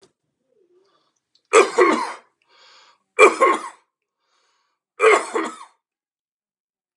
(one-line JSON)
{"three_cough_length": "7.0 s", "three_cough_amplitude": 32768, "three_cough_signal_mean_std_ratio": 0.31, "survey_phase": "beta (2021-08-13 to 2022-03-07)", "age": "45-64", "gender": "Male", "wearing_mask": "No", "symptom_cough_any": true, "smoker_status": "Current smoker (e-cigarettes or vapes only)", "respiratory_condition_asthma": false, "respiratory_condition_other": false, "recruitment_source": "REACT", "submission_delay": "1 day", "covid_test_result": "Negative", "covid_test_method": "RT-qPCR", "influenza_a_test_result": "Negative", "influenza_b_test_result": "Negative"}